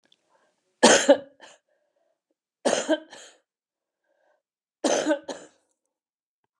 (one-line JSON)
{"three_cough_length": "6.6 s", "three_cough_amplitude": 27564, "three_cough_signal_mean_std_ratio": 0.27, "survey_phase": "alpha (2021-03-01 to 2021-08-12)", "age": "65+", "gender": "Female", "wearing_mask": "No", "symptom_headache": true, "symptom_onset": "8 days", "smoker_status": "Never smoked", "respiratory_condition_asthma": false, "respiratory_condition_other": false, "recruitment_source": "REACT", "submission_delay": "1 day", "covid_test_result": "Negative", "covid_test_method": "RT-qPCR"}